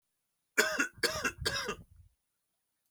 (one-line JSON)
{"three_cough_length": "2.9 s", "three_cough_amplitude": 9931, "three_cough_signal_mean_std_ratio": 0.42, "survey_phase": "beta (2021-08-13 to 2022-03-07)", "age": "45-64", "gender": "Male", "wearing_mask": "No", "symptom_none": true, "smoker_status": "Ex-smoker", "respiratory_condition_asthma": false, "respiratory_condition_other": false, "recruitment_source": "REACT", "submission_delay": "8 days", "covid_test_result": "Negative", "covid_test_method": "RT-qPCR", "influenza_a_test_result": "Negative", "influenza_b_test_result": "Negative"}